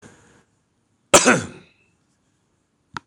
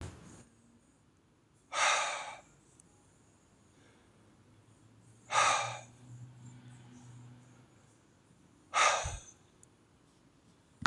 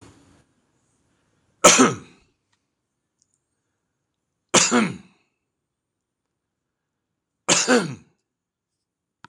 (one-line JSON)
{"cough_length": "3.1 s", "cough_amplitude": 26028, "cough_signal_mean_std_ratio": 0.23, "exhalation_length": "10.9 s", "exhalation_amplitude": 9533, "exhalation_signal_mean_std_ratio": 0.33, "three_cough_length": "9.3 s", "three_cough_amplitude": 26028, "three_cough_signal_mean_std_ratio": 0.25, "survey_phase": "beta (2021-08-13 to 2022-03-07)", "age": "65+", "gender": "Male", "wearing_mask": "No", "symptom_none": true, "symptom_onset": "12 days", "smoker_status": "Ex-smoker", "respiratory_condition_asthma": false, "respiratory_condition_other": false, "recruitment_source": "REACT", "submission_delay": "12 days", "covid_test_result": "Negative", "covid_test_method": "RT-qPCR", "influenza_a_test_result": "Negative", "influenza_b_test_result": "Negative"}